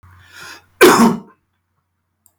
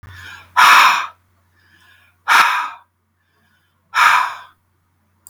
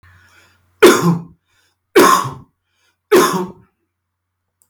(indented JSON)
{
  "cough_length": "2.4 s",
  "cough_amplitude": 32768,
  "cough_signal_mean_std_ratio": 0.34,
  "exhalation_length": "5.3 s",
  "exhalation_amplitude": 32768,
  "exhalation_signal_mean_std_ratio": 0.4,
  "three_cough_length": "4.7 s",
  "three_cough_amplitude": 32768,
  "three_cough_signal_mean_std_ratio": 0.38,
  "survey_phase": "beta (2021-08-13 to 2022-03-07)",
  "age": "45-64",
  "gender": "Male",
  "wearing_mask": "No",
  "symptom_none": true,
  "smoker_status": "Never smoked",
  "respiratory_condition_asthma": false,
  "respiratory_condition_other": false,
  "recruitment_source": "REACT",
  "submission_delay": "1 day",
  "covid_test_result": "Negative",
  "covid_test_method": "RT-qPCR",
  "influenza_a_test_result": "Negative",
  "influenza_b_test_result": "Negative"
}